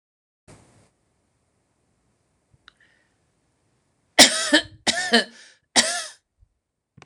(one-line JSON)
{"three_cough_length": "7.1 s", "three_cough_amplitude": 26028, "three_cough_signal_mean_std_ratio": 0.25, "survey_phase": "beta (2021-08-13 to 2022-03-07)", "age": "65+", "gender": "Female", "wearing_mask": "No", "symptom_none": true, "smoker_status": "Never smoked", "respiratory_condition_asthma": false, "respiratory_condition_other": false, "recruitment_source": "REACT", "submission_delay": "1 day", "covid_test_result": "Negative", "covid_test_method": "RT-qPCR"}